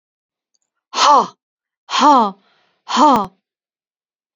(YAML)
exhalation_length: 4.4 s
exhalation_amplitude: 32767
exhalation_signal_mean_std_ratio: 0.39
survey_phase: beta (2021-08-13 to 2022-03-07)
age: 45-64
gender: Female
wearing_mask: 'No'
symptom_none: true
smoker_status: Ex-smoker
respiratory_condition_asthma: false
respiratory_condition_other: false
recruitment_source: REACT
submission_delay: 2 days
covid_test_result: Negative
covid_test_method: RT-qPCR